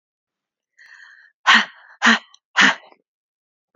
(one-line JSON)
{"exhalation_length": "3.8 s", "exhalation_amplitude": 28895, "exhalation_signal_mean_std_ratio": 0.29, "survey_phase": "beta (2021-08-13 to 2022-03-07)", "age": "18-44", "gender": "Female", "wearing_mask": "No", "symptom_cough_any": true, "symptom_headache": true, "symptom_change_to_sense_of_smell_or_taste": true, "symptom_loss_of_taste": true, "symptom_other": true, "smoker_status": "Never smoked", "respiratory_condition_asthma": false, "respiratory_condition_other": false, "recruitment_source": "Test and Trace", "submission_delay": "3 days", "covid_test_result": "Positive", "covid_test_method": "ePCR"}